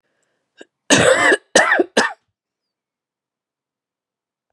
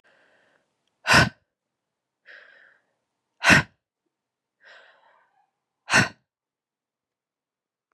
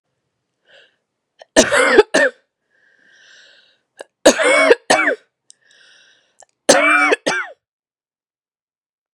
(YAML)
cough_length: 4.5 s
cough_amplitude: 32768
cough_signal_mean_std_ratio: 0.35
exhalation_length: 7.9 s
exhalation_amplitude: 24483
exhalation_signal_mean_std_ratio: 0.21
three_cough_length: 9.1 s
three_cough_amplitude: 32768
three_cough_signal_mean_std_ratio: 0.36
survey_phase: beta (2021-08-13 to 2022-03-07)
age: 18-44
gender: Female
wearing_mask: 'No'
symptom_cough_any: true
symptom_runny_or_blocked_nose: true
symptom_sore_throat: true
symptom_fatigue: true
symptom_headache: true
symptom_onset: 4 days
smoker_status: Ex-smoker
respiratory_condition_asthma: false
respiratory_condition_other: false
recruitment_source: Test and Trace
submission_delay: 2 days
covid_test_result: Positive
covid_test_method: RT-qPCR
covid_ct_value: 16.3
covid_ct_gene: ORF1ab gene
covid_ct_mean: 16.7
covid_viral_load: 3300000 copies/ml
covid_viral_load_category: High viral load (>1M copies/ml)